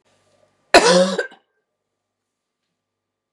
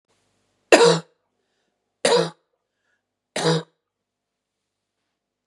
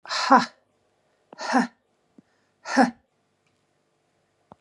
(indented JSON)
{
  "cough_length": "3.3 s",
  "cough_amplitude": 32768,
  "cough_signal_mean_std_ratio": 0.28,
  "three_cough_length": "5.5 s",
  "three_cough_amplitude": 32768,
  "three_cough_signal_mean_std_ratio": 0.27,
  "exhalation_length": "4.6 s",
  "exhalation_amplitude": 22893,
  "exhalation_signal_mean_std_ratio": 0.29,
  "survey_phase": "beta (2021-08-13 to 2022-03-07)",
  "age": "45-64",
  "gender": "Female",
  "wearing_mask": "No",
  "symptom_cough_any": true,
  "symptom_runny_or_blocked_nose": true,
  "symptom_fatigue": true,
  "symptom_headache": true,
  "symptom_onset": "6 days",
  "smoker_status": "Ex-smoker",
  "respiratory_condition_asthma": false,
  "respiratory_condition_other": false,
  "recruitment_source": "Test and Trace",
  "submission_delay": "2 days",
  "covid_test_result": "Positive",
  "covid_test_method": "RT-qPCR",
  "covid_ct_value": 17.5,
  "covid_ct_gene": "ORF1ab gene",
  "covid_ct_mean": 17.6,
  "covid_viral_load": "1700000 copies/ml",
  "covid_viral_load_category": "High viral load (>1M copies/ml)"
}